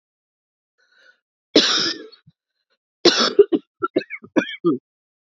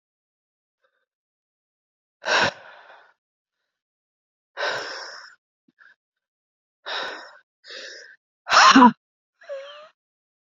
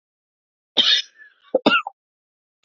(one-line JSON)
{"three_cough_length": "5.4 s", "three_cough_amplitude": 32767, "three_cough_signal_mean_std_ratio": 0.33, "exhalation_length": "10.6 s", "exhalation_amplitude": 27570, "exhalation_signal_mean_std_ratio": 0.24, "cough_length": "2.6 s", "cough_amplitude": 27995, "cough_signal_mean_std_ratio": 0.32, "survey_phase": "beta (2021-08-13 to 2022-03-07)", "age": "18-44", "gender": "Female", "wearing_mask": "No", "symptom_cough_any": true, "symptom_runny_or_blocked_nose": true, "symptom_sore_throat": true, "symptom_fatigue": true, "symptom_headache": true, "symptom_onset": "3 days", "smoker_status": "Never smoked", "respiratory_condition_asthma": true, "respiratory_condition_other": false, "recruitment_source": "Test and Trace", "submission_delay": "2 days", "covid_test_result": "Positive", "covid_test_method": "LAMP"}